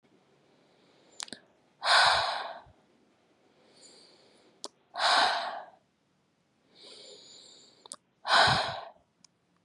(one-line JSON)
{"exhalation_length": "9.6 s", "exhalation_amplitude": 10791, "exhalation_signal_mean_std_ratio": 0.35, "survey_phase": "beta (2021-08-13 to 2022-03-07)", "age": "18-44", "gender": "Female", "wearing_mask": "No", "symptom_none": true, "symptom_onset": "3 days", "smoker_status": "Current smoker (1 to 10 cigarettes per day)", "respiratory_condition_asthma": false, "respiratory_condition_other": false, "recruitment_source": "REACT", "submission_delay": "1 day", "covid_test_result": "Negative", "covid_test_method": "RT-qPCR", "influenza_a_test_result": "Negative", "influenza_b_test_result": "Negative"}